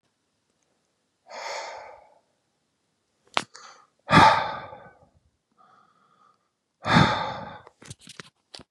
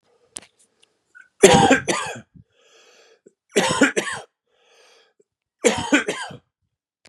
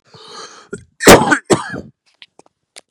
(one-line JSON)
{"exhalation_length": "8.7 s", "exhalation_amplitude": 30475, "exhalation_signal_mean_std_ratio": 0.27, "three_cough_length": "7.1 s", "three_cough_amplitude": 32768, "three_cough_signal_mean_std_ratio": 0.34, "cough_length": "2.9 s", "cough_amplitude": 32768, "cough_signal_mean_std_ratio": 0.32, "survey_phase": "beta (2021-08-13 to 2022-03-07)", "age": "45-64", "gender": "Male", "wearing_mask": "No", "symptom_none": true, "smoker_status": "Ex-smoker", "respiratory_condition_asthma": false, "respiratory_condition_other": false, "recruitment_source": "REACT", "submission_delay": "0 days", "covid_test_result": "Negative", "covid_test_method": "RT-qPCR", "influenza_a_test_result": "Unknown/Void", "influenza_b_test_result": "Unknown/Void"}